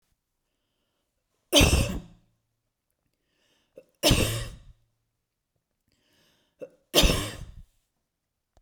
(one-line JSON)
{"three_cough_length": "8.6 s", "three_cough_amplitude": 19435, "three_cough_signal_mean_std_ratio": 0.28, "survey_phase": "beta (2021-08-13 to 2022-03-07)", "age": "45-64", "gender": "Female", "wearing_mask": "No", "symptom_none": true, "smoker_status": "Never smoked", "respiratory_condition_asthma": false, "respiratory_condition_other": false, "recruitment_source": "REACT", "submission_delay": "2 days", "covid_test_result": "Negative", "covid_test_method": "RT-qPCR"}